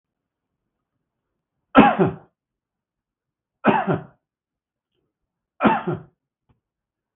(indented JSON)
{
  "three_cough_length": "7.2 s",
  "three_cough_amplitude": 32761,
  "three_cough_signal_mean_std_ratio": 0.26,
  "survey_phase": "beta (2021-08-13 to 2022-03-07)",
  "age": "65+",
  "gender": "Male",
  "wearing_mask": "No",
  "symptom_none": true,
  "smoker_status": "Ex-smoker",
  "respiratory_condition_asthma": false,
  "respiratory_condition_other": false,
  "recruitment_source": "REACT",
  "submission_delay": "1 day",
  "covid_test_result": "Negative",
  "covid_test_method": "RT-qPCR",
  "influenza_a_test_result": "Negative",
  "influenza_b_test_result": "Negative"
}